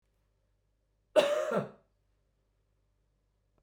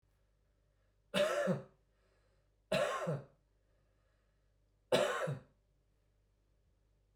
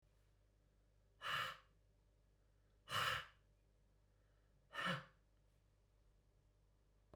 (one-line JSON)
{"cough_length": "3.6 s", "cough_amplitude": 8884, "cough_signal_mean_std_ratio": 0.28, "three_cough_length": "7.2 s", "three_cough_amplitude": 3911, "three_cough_signal_mean_std_ratio": 0.37, "exhalation_length": "7.2 s", "exhalation_amplitude": 1243, "exhalation_signal_mean_std_ratio": 0.34, "survey_phase": "beta (2021-08-13 to 2022-03-07)", "age": "45-64", "gender": "Male", "wearing_mask": "No", "symptom_none": true, "symptom_onset": "12 days", "smoker_status": "Never smoked", "respiratory_condition_asthma": false, "respiratory_condition_other": false, "recruitment_source": "REACT", "submission_delay": "1 day", "covid_test_result": "Negative", "covid_test_method": "RT-qPCR"}